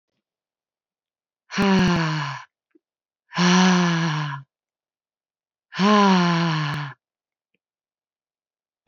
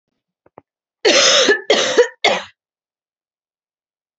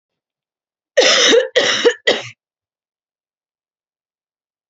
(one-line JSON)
{"exhalation_length": "8.9 s", "exhalation_amplitude": 23135, "exhalation_signal_mean_std_ratio": 0.47, "three_cough_length": "4.2 s", "three_cough_amplitude": 32767, "three_cough_signal_mean_std_ratio": 0.41, "cough_length": "4.7 s", "cough_amplitude": 32141, "cough_signal_mean_std_ratio": 0.37, "survey_phase": "beta (2021-08-13 to 2022-03-07)", "age": "18-44", "gender": "Female", "wearing_mask": "No", "symptom_cough_any": true, "symptom_new_continuous_cough": true, "symptom_runny_or_blocked_nose": true, "symptom_sore_throat": true, "symptom_onset": "3 days", "smoker_status": "Never smoked", "respiratory_condition_asthma": false, "respiratory_condition_other": false, "recruitment_source": "Test and Trace", "submission_delay": "1 day", "covid_test_result": "Positive", "covid_test_method": "RT-qPCR", "covid_ct_value": 36.3, "covid_ct_gene": "ORF1ab gene"}